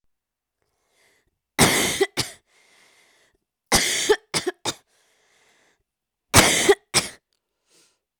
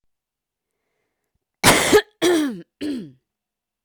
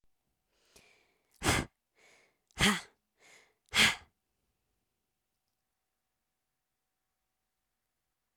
{
  "three_cough_length": "8.2 s",
  "three_cough_amplitude": 31571,
  "three_cough_signal_mean_std_ratio": 0.33,
  "cough_length": "3.8 s",
  "cough_amplitude": 31080,
  "cough_signal_mean_std_ratio": 0.37,
  "exhalation_length": "8.4 s",
  "exhalation_amplitude": 8171,
  "exhalation_signal_mean_std_ratio": 0.21,
  "survey_phase": "alpha (2021-03-01 to 2021-08-12)",
  "age": "18-44",
  "gender": "Female",
  "wearing_mask": "No",
  "symptom_cough_any": true,
  "symptom_fatigue": true,
  "symptom_onset": "4 days",
  "smoker_status": "Never smoked",
  "respiratory_condition_asthma": false,
  "respiratory_condition_other": false,
  "recruitment_source": "Test and Trace",
  "submission_delay": "1 day",
  "covid_test_result": "Positive",
  "covid_test_method": "RT-qPCR"
}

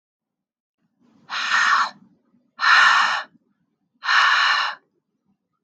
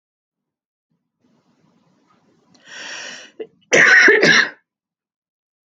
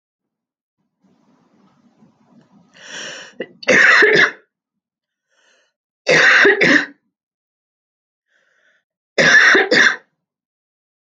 {
  "exhalation_length": "5.6 s",
  "exhalation_amplitude": 21823,
  "exhalation_signal_mean_std_ratio": 0.48,
  "cough_length": "5.7 s",
  "cough_amplitude": 30432,
  "cough_signal_mean_std_ratio": 0.32,
  "three_cough_length": "11.2 s",
  "three_cough_amplitude": 30054,
  "three_cough_signal_mean_std_ratio": 0.38,
  "survey_phase": "alpha (2021-03-01 to 2021-08-12)",
  "age": "18-44",
  "gender": "Female",
  "wearing_mask": "No",
  "symptom_none": true,
  "smoker_status": "Never smoked",
  "respiratory_condition_asthma": false,
  "respiratory_condition_other": false,
  "recruitment_source": "REACT",
  "submission_delay": "1 day",
  "covid_test_result": "Negative",
  "covid_test_method": "RT-qPCR"
}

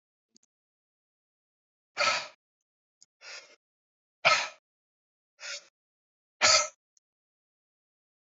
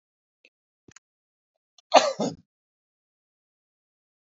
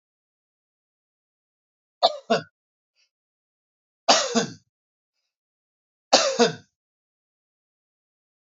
{
  "exhalation_length": "8.4 s",
  "exhalation_amplitude": 15197,
  "exhalation_signal_mean_std_ratio": 0.23,
  "cough_length": "4.4 s",
  "cough_amplitude": 28080,
  "cough_signal_mean_std_ratio": 0.17,
  "three_cough_length": "8.4 s",
  "three_cough_amplitude": 31841,
  "three_cough_signal_mean_std_ratio": 0.24,
  "survey_phase": "alpha (2021-03-01 to 2021-08-12)",
  "age": "45-64",
  "gender": "Male",
  "wearing_mask": "No",
  "symptom_none": true,
  "smoker_status": "Never smoked",
  "respiratory_condition_asthma": false,
  "respiratory_condition_other": false,
  "recruitment_source": "REACT",
  "submission_delay": "1 day",
  "covid_test_result": "Negative",
  "covid_test_method": "RT-qPCR"
}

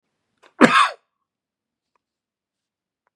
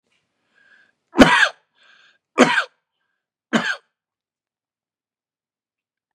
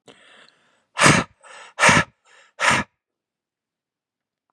{
  "cough_length": "3.2 s",
  "cough_amplitude": 32768,
  "cough_signal_mean_std_ratio": 0.22,
  "three_cough_length": "6.1 s",
  "three_cough_amplitude": 32768,
  "three_cough_signal_mean_std_ratio": 0.25,
  "exhalation_length": "4.5 s",
  "exhalation_amplitude": 30401,
  "exhalation_signal_mean_std_ratio": 0.32,
  "survey_phase": "beta (2021-08-13 to 2022-03-07)",
  "age": "45-64",
  "gender": "Male",
  "wearing_mask": "No",
  "symptom_none": true,
  "smoker_status": "Ex-smoker",
  "respiratory_condition_asthma": false,
  "respiratory_condition_other": false,
  "recruitment_source": "REACT",
  "submission_delay": "1 day",
  "covid_test_result": "Negative",
  "covid_test_method": "RT-qPCR",
  "influenza_a_test_result": "Negative",
  "influenza_b_test_result": "Negative"
}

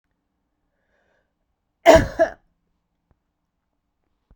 {
  "cough_length": "4.4 s",
  "cough_amplitude": 32768,
  "cough_signal_mean_std_ratio": 0.19,
  "survey_phase": "beta (2021-08-13 to 2022-03-07)",
  "age": "45-64",
  "gender": "Female",
  "wearing_mask": "No",
  "symptom_none": true,
  "symptom_onset": "4 days",
  "smoker_status": "Ex-smoker",
  "respiratory_condition_asthma": false,
  "respiratory_condition_other": false,
  "recruitment_source": "REACT",
  "submission_delay": "3 days",
  "covid_test_result": "Negative",
  "covid_test_method": "RT-qPCR"
}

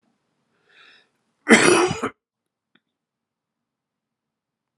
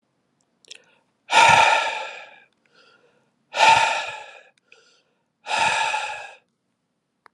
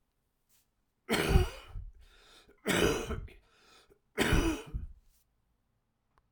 {
  "cough_length": "4.8 s",
  "cough_amplitude": 32517,
  "cough_signal_mean_std_ratio": 0.24,
  "exhalation_length": "7.3 s",
  "exhalation_amplitude": 26238,
  "exhalation_signal_mean_std_ratio": 0.39,
  "three_cough_length": "6.3 s",
  "three_cough_amplitude": 8625,
  "three_cough_signal_mean_std_ratio": 0.4,
  "survey_phase": "alpha (2021-03-01 to 2021-08-12)",
  "age": "45-64",
  "gender": "Male",
  "wearing_mask": "No",
  "symptom_fever_high_temperature": true,
  "symptom_change_to_sense_of_smell_or_taste": true,
  "symptom_onset": "5 days",
  "smoker_status": "Never smoked",
  "respiratory_condition_asthma": false,
  "respiratory_condition_other": false,
  "recruitment_source": "Test and Trace",
  "submission_delay": "1 day",
  "covid_test_result": "Positive",
  "covid_test_method": "RT-qPCR",
  "covid_ct_value": 16.9,
  "covid_ct_gene": "ORF1ab gene",
  "covid_ct_mean": 17.3,
  "covid_viral_load": "2200000 copies/ml",
  "covid_viral_load_category": "High viral load (>1M copies/ml)"
}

